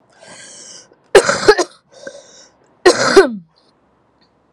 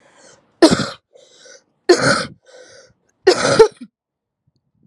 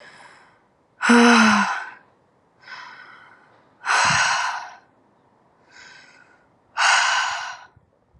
{"cough_length": "4.5 s", "cough_amplitude": 32768, "cough_signal_mean_std_ratio": 0.33, "three_cough_length": "4.9 s", "three_cough_amplitude": 32768, "three_cough_signal_mean_std_ratio": 0.33, "exhalation_length": "8.2 s", "exhalation_amplitude": 28655, "exhalation_signal_mean_std_ratio": 0.43, "survey_phase": "alpha (2021-03-01 to 2021-08-12)", "age": "18-44", "gender": "Female", "wearing_mask": "No", "symptom_cough_any": true, "symptom_new_continuous_cough": true, "symptom_shortness_of_breath": true, "symptom_abdominal_pain": true, "symptom_diarrhoea": true, "symptom_fatigue": true, "symptom_fever_high_temperature": true, "symptom_headache": true, "symptom_change_to_sense_of_smell_or_taste": true, "symptom_loss_of_taste": true, "symptom_onset": "3 days", "smoker_status": "Current smoker (1 to 10 cigarettes per day)", "respiratory_condition_asthma": false, "respiratory_condition_other": false, "recruitment_source": "Test and Trace", "submission_delay": "1 day", "covid_test_result": "Positive", "covid_test_method": "RT-qPCR"}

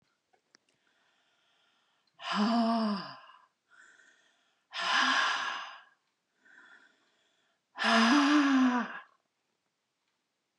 {"exhalation_length": "10.6 s", "exhalation_amplitude": 6882, "exhalation_signal_mean_std_ratio": 0.44, "survey_phase": "beta (2021-08-13 to 2022-03-07)", "age": "65+", "gender": "Female", "wearing_mask": "No", "symptom_runny_or_blocked_nose": true, "symptom_onset": "8 days", "smoker_status": "Never smoked", "respiratory_condition_asthma": false, "respiratory_condition_other": false, "recruitment_source": "REACT", "submission_delay": "3 days", "covid_test_result": "Negative", "covid_test_method": "RT-qPCR", "influenza_a_test_result": "Negative", "influenza_b_test_result": "Negative"}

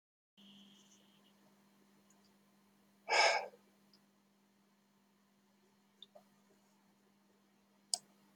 {"exhalation_length": "8.4 s", "exhalation_amplitude": 5211, "exhalation_signal_mean_std_ratio": 0.2, "survey_phase": "beta (2021-08-13 to 2022-03-07)", "age": "65+", "gender": "Male", "wearing_mask": "No", "symptom_loss_of_taste": true, "smoker_status": "Never smoked", "respiratory_condition_asthma": false, "respiratory_condition_other": false, "recruitment_source": "REACT", "submission_delay": "4 days", "covid_test_result": "Negative", "covid_test_method": "RT-qPCR"}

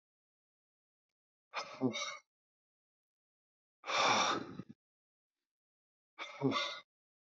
{"exhalation_length": "7.3 s", "exhalation_amplitude": 3771, "exhalation_signal_mean_std_ratio": 0.34, "survey_phase": "beta (2021-08-13 to 2022-03-07)", "age": "45-64", "gender": "Male", "wearing_mask": "No", "symptom_none": true, "smoker_status": "Never smoked", "respiratory_condition_asthma": false, "respiratory_condition_other": false, "recruitment_source": "REACT", "submission_delay": "1 day", "covid_test_result": "Negative", "covid_test_method": "RT-qPCR", "influenza_a_test_result": "Negative", "influenza_b_test_result": "Negative"}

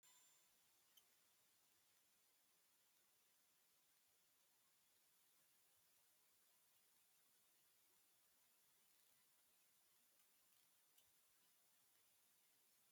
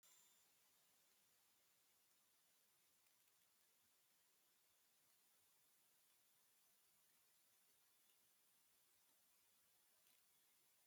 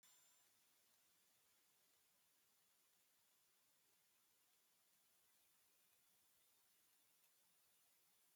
{"exhalation_length": "12.9 s", "exhalation_amplitude": 51, "exhalation_signal_mean_std_ratio": 1.06, "three_cough_length": "10.9 s", "three_cough_amplitude": 43, "three_cough_signal_mean_std_ratio": 1.07, "cough_length": "8.4 s", "cough_amplitude": 37, "cough_signal_mean_std_ratio": 1.06, "survey_phase": "alpha (2021-03-01 to 2021-08-12)", "age": "45-64", "gender": "Female", "wearing_mask": "No", "symptom_none": true, "smoker_status": "Ex-smoker", "respiratory_condition_asthma": false, "respiratory_condition_other": false, "recruitment_source": "REACT", "submission_delay": "1 day", "covid_test_result": "Negative", "covid_test_method": "RT-qPCR"}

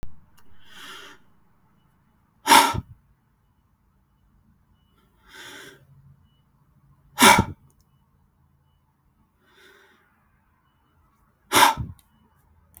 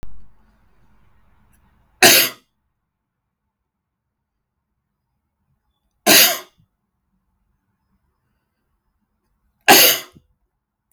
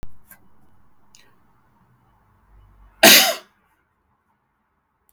{"exhalation_length": "12.8 s", "exhalation_amplitude": 31994, "exhalation_signal_mean_std_ratio": 0.22, "three_cough_length": "10.9 s", "three_cough_amplitude": 32768, "three_cough_signal_mean_std_ratio": 0.24, "cough_length": "5.1 s", "cough_amplitude": 32768, "cough_signal_mean_std_ratio": 0.22, "survey_phase": "beta (2021-08-13 to 2022-03-07)", "age": "45-64", "gender": "Male", "wearing_mask": "No", "symptom_none": true, "smoker_status": "Never smoked", "respiratory_condition_asthma": false, "respiratory_condition_other": false, "recruitment_source": "REACT", "submission_delay": "2 days", "covid_test_result": "Negative", "covid_test_method": "RT-qPCR", "influenza_a_test_result": "Negative", "influenza_b_test_result": "Negative"}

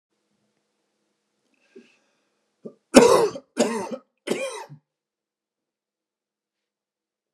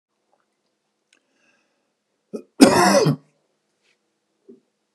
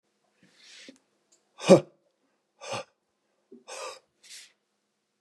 {"three_cough_length": "7.3 s", "three_cough_amplitude": 32768, "three_cough_signal_mean_std_ratio": 0.23, "cough_length": "4.9 s", "cough_amplitude": 32768, "cough_signal_mean_std_ratio": 0.26, "exhalation_length": "5.2 s", "exhalation_amplitude": 24180, "exhalation_signal_mean_std_ratio": 0.16, "survey_phase": "beta (2021-08-13 to 2022-03-07)", "age": "45-64", "gender": "Male", "wearing_mask": "No", "symptom_none": true, "smoker_status": "Ex-smoker", "respiratory_condition_asthma": false, "respiratory_condition_other": false, "recruitment_source": "Test and Trace", "submission_delay": "1 day", "covid_test_result": "Negative", "covid_test_method": "RT-qPCR"}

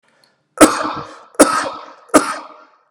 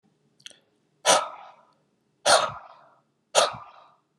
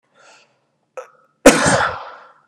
{"three_cough_length": "2.9 s", "three_cough_amplitude": 32768, "three_cough_signal_mean_std_ratio": 0.38, "exhalation_length": "4.2 s", "exhalation_amplitude": 21093, "exhalation_signal_mean_std_ratio": 0.31, "cough_length": "2.5 s", "cough_amplitude": 32768, "cough_signal_mean_std_ratio": 0.33, "survey_phase": "beta (2021-08-13 to 2022-03-07)", "age": "45-64", "gender": "Male", "wearing_mask": "No", "symptom_none": true, "smoker_status": "Ex-smoker", "respiratory_condition_asthma": false, "respiratory_condition_other": false, "recruitment_source": "REACT", "submission_delay": "2 days", "covid_test_result": "Negative", "covid_test_method": "RT-qPCR", "influenza_a_test_result": "Negative", "influenza_b_test_result": "Negative"}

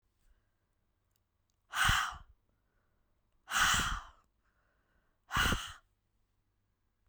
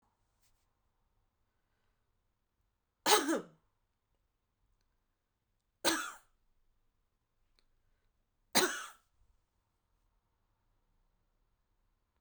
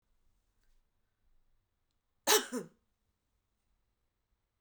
{"exhalation_length": "7.1 s", "exhalation_amplitude": 5123, "exhalation_signal_mean_std_ratio": 0.34, "three_cough_length": "12.2 s", "three_cough_amplitude": 8928, "three_cough_signal_mean_std_ratio": 0.2, "cough_length": "4.6 s", "cough_amplitude": 8991, "cough_signal_mean_std_ratio": 0.18, "survey_phase": "beta (2021-08-13 to 2022-03-07)", "age": "45-64", "gender": "Female", "wearing_mask": "No", "symptom_none": true, "smoker_status": "Never smoked", "respiratory_condition_asthma": false, "respiratory_condition_other": false, "recruitment_source": "REACT", "submission_delay": "2 days", "covid_test_result": "Negative", "covid_test_method": "RT-qPCR"}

